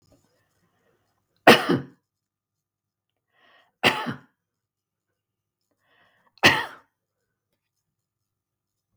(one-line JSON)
{"three_cough_length": "9.0 s", "three_cough_amplitude": 32768, "three_cough_signal_mean_std_ratio": 0.19, "survey_phase": "beta (2021-08-13 to 2022-03-07)", "age": "65+", "gender": "Female", "wearing_mask": "No", "symptom_runny_or_blocked_nose": true, "smoker_status": "Never smoked", "respiratory_condition_asthma": false, "respiratory_condition_other": false, "recruitment_source": "REACT", "submission_delay": "1 day", "covid_test_result": "Negative", "covid_test_method": "RT-qPCR"}